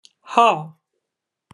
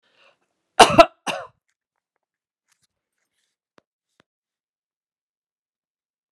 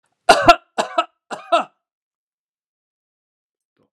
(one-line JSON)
{"exhalation_length": "1.5 s", "exhalation_amplitude": 27436, "exhalation_signal_mean_std_ratio": 0.31, "cough_length": "6.3 s", "cough_amplitude": 32768, "cough_signal_mean_std_ratio": 0.14, "three_cough_length": "3.9 s", "three_cough_amplitude": 32768, "three_cough_signal_mean_std_ratio": 0.24, "survey_phase": "alpha (2021-03-01 to 2021-08-12)", "age": "65+", "gender": "Female", "wearing_mask": "No", "symptom_none": true, "smoker_status": "Ex-smoker", "respiratory_condition_asthma": false, "respiratory_condition_other": false, "recruitment_source": "REACT", "submission_delay": "2 days", "covid_test_method": "RT-qPCR"}